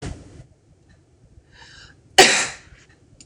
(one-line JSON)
{"cough_length": "3.3 s", "cough_amplitude": 26028, "cough_signal_mean_std_ratio": 0.26, "survey_phase": "beta (2021-08-13 to 2022-03-07)", "age": "18-44", "gender": "Female", "wearing_mask": "No", "symptom_new_continuous_cough": true, "symptom_runny_or_blocked_nose": true, "symptom_fatigue": true, "smoker_status": "Never smoked", "respiratory_condition_asthma": false, "respiratory_condition_other": false, "recruitment_source": "Test and Trace", "submission_delay": "2 days", "covid_test_result": "Positive", "covid_test_method": "ePCR"}